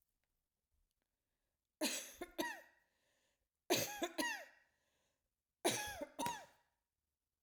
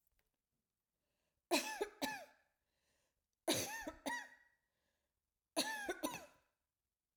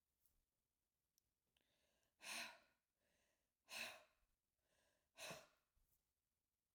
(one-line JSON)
{"three_cough_length": "7.4 s", "three_cough_amplitude": 2847, "three_cough_signal_mean_std_ratio": 0.37, "cough_length": "7.2 s", "cough_amplitude": 3050, "cough_signal_mean_std_ratio": 0.37, "exhalation_length": "6.7 s", "exhalation_amplitude": 412, "exhalation_signal_mean_std_ratio": 0.31, "survey_phase": "alpha (2021-03-01 to 2021-08-12)", "age": "45-64", "gender": "Female", "wearing_mask": "No", "symptom_none": true, "smoker_status": "Never smoked", "respiratory_condition_asthma": false, "respiratory_condition_other": false, "recruitment_source": "REACT", "submission_delay": "1 day", "covid_test_result": "Negative", "covid_test_method": "RT-qPCR"}